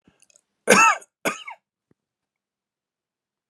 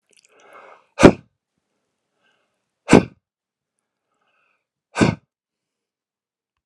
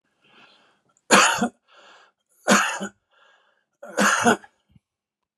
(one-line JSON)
{"cough_length": "3.5 s", "cough_amplitude": 31581, "cough_signal_mean_std_ratio": 0.25, "exhalation_length": "6.7 s", "exhalation_amplitude": 32768, "exhalation_signal_mean_std_ratio": 0.17, "three_cough_length": "5.4 s", "three_cough_amplitude": 30445, "three_cough_signal_mean_std_ratio": 0.35, "survey_phase": "alpha (2021-03-01 to 2021-08-12)", "age": "65+", "gender": "Male", "wearing_mask": "No", "symptom_none": true, "smoker_status": "Never smoked", "respiratory_condition_asthma": false, "respiratory_condition_other": false, "recruitment_source": "REACT", "submission_delay": "2 days", "covid_test_result": "Negative", "covid_test_method": "RT-qPCR"}